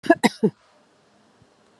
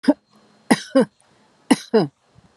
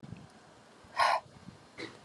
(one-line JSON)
{"cough_length": "1.8 s", "cough_amplitude": 28353, "cough_signal_mean_std_ratio": 0.24, "three_cough_length": "2.6 s", "three_cough_amplitude": 31302, "three_cough_signal_mean_std_ratio": 0.32, "exhalation_length": "2.0 s", "exhalation_amplitude": 6285, "exhalation_signal_mean_std_ratio": 0.38, "survey_phase": "beta (2021-08-13 to 2022-03-07)", "age": "65+", "gender": "Female", "wearing_mask": "No", "symptom_none": true, "smoker_status": "Never smoked", "respiratory_condition_asthma": false, "respiratory_condition_other": false, "recruitment_source": "REACT", "submission_delay": "1 day", "covid_test_result": "Negative", "covid_test_method": "RT-qPCR"}